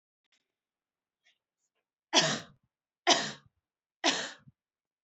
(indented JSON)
{
  "three_cough_length": "5.0 s",
  "three_cough_amplitude": 13754,
  "three_cough_signal_mean_std_ratio": 0.27,
  "survey_phase": "beta (2021-08-13 to 2022-03-07)",
  "age": "18-44",
  "gender": "Female",
  "wearing_mask": "No",
  "symptom_runny_or_blocked_nose": true,
  "symptom_onset": "8 days",
  "smoker_status": "Never smoked",
  "respiratory_condition_asthma": true,
  "respiratory_condition_other": false,
  "recruitment_source": "REACT",
  "submission_delay": "3 days",
  "covid_test_result": "Negative",
  "covid_test_method": "RT-qPCR",
  "influenza_a_test_result": "Negative",
  "influenza_b_test_result": "Negative"
}